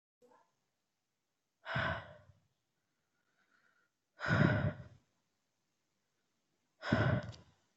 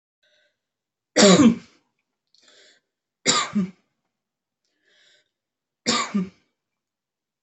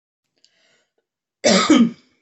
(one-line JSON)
{"exhalation_length": "7.8 s", "exhalation_amplitude": 5771, "exhalation_signal_mean_std_ratio": 0.32, "three_cough_length": "7.4 s", "three_cough_amplitude": 27580, "three_cough_signal_mean_std_ratio": 0.28, "cough_length": "2.2 s", "cough_amplitude": 25516, "cough_signal_mean_std_ratio": 0.37, "survey_phase": "beta (2021-08-13 to 2022-03-07)", "age": "18-44", "gender": "Female", "wearing_mask": "No", "symptom_none": true, "smoker_status": "Never smoked", "respiratory_condition_asthma": false, "respiratory_condition_other": false, "recruitment_source": "REACT", "submission_delay": "1 day", "covid_test_result": "Negative", "covid_test_method": "RT-qPCR"}